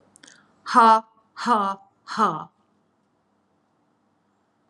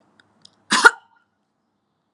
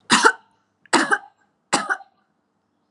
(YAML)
exhalation_length: 4.7 s
exhalation_amplitude: 24906
exhalation_signal_mean_std_ratio: 0.32
cough_length: 2.1 s
cough_amplitude: 32768
cough_signal_mean_std_ratio: 0.2
three_cough_length: 2.9 s
three_cough_amplitude: 31783
three_cough_signal_mean_std_ratio: 0.35
survey_phase: alpha (2021-03-01 to 2021-08-12)
age: 45-64
gender: Female
wearing_mask: 'No'
symptom_none: true
smoker_status: Never smoked
respiratory_condition_asthma: false
respiratory_condition_other: false
recruitment_source: REACT
submission_delay: 2 days
covid_test_result: Negative
covid_test_method: RT-qPCR